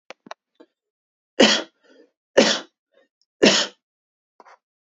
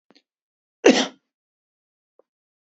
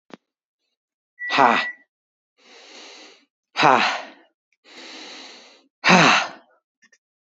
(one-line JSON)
{"three_cough_length": "4.9 s", "three_cough_amplitude": 32767, "three_cough_signal_mean_std_ratio": 0.28, "cough_length": "2.7 s", "cough_amplitude": 28746, "cough_signal_mean_std_ratio": 0.19, "exhalation_length": "7.3 s", "exhalation_amplitude": 29149, "exhalation_signal_mean_std_ratio": 0.33, "survey_phase": "beta (2021-08-13 to 2022-03-07)", "age": "45-64", "gender": "Male", "wearing_mask": "No", "symptom_none": true, "smoker_status": "Never smoked", "respiratory_condition_asthma": false, "respiratory_condition_other": false, "recruitment_source": "REACT", "submission_delay": "2 days", "covid_test_result": "Negative", "covid_test_method": "RT-qPCR", "influenza_a_test_result": "Negative", "influenza_b_test_result": "Negative"}